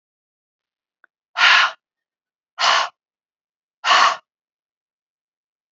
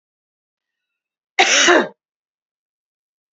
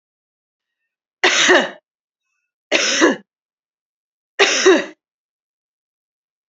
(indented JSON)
{
  "exhalation_length": "5.7 s",
  "exhalation_amplitude": 27045,
  "exhalation_signal_mean_std_ratio": 0.31,
  "cough_length": "3.3 s",
  "cough_amplitude": 29865,
  "cough_signal_mean_std_ratio": 0.3,
  "three_cough_length": "6.5 s",
  "three_cough_amplitude": 31778,
  "three_cough_signal_mean_std_ratio": 0.35,
  "survey_phase": "beta (2021-08-13 to 2022-03-07)",
  "age": "45-64",
  "gender": "Female",
  "wearing_mask": "No",
  "symptom_none": true,
  "smoker_status": "Never smoked",
  "respiratory_condition_asthma": false,
  "respiratory_condition_other": false,
  "recruitment_source": "REACT",
  "submission_delay": "2 days",
  "covid_test_result": "Negative",
  "covid_test_method": "RT-qPCR",
  "influenza_a_test_result": "Negative",
  "influenza_b_test_result": "Negative"
}